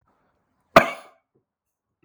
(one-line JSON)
{"cough_length": "2.0 s", "cough_amplitude": 32768, "cough_signal_mean_std_ratio": 0.16, "survey_phase": "beta (2021-08-13 to 2022-03-07)", "age": "18-44", "gender": "Male", "wearing_mask": "No", "symptom_cough_any": true, "symptom_runny_or_blocked_nose": true, "symptom_fatigue": true, "symptom_onset": "2 days", "smoker_status": "Never smoked", "respiratory_condition_asthma": false, "respiratory_condition_other": false, "recruitment_source": "REACT", "submission_delay": "1 day", "covid_test_result": "Negative", "covid_test_method": "RT-qPCR"}